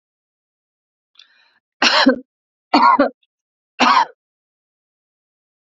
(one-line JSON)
{"three_cough_length": "5.6 s", "three_cough_amplitude": 32767, "three_cough_signal_mean_std_ratio": 0.33, "survey_phase": "beta (2021-08-13 to 2022-03-07)", "age": "45-64", "gender": "Female", "wearing_mask": "No", "symptom_none": true, "smoker_status": "Ex-smoker", "respiratory_condition_asthma": false, "respiratory_condition_other": false, "recruitment_source": "REACT", "submission_delay": "2 days", "covid_test_result": "Negative", "covid_test_method": "RT-qPCR", "influenza_a_test_result": "Negative", "influenza_b_test_result": "Negative"}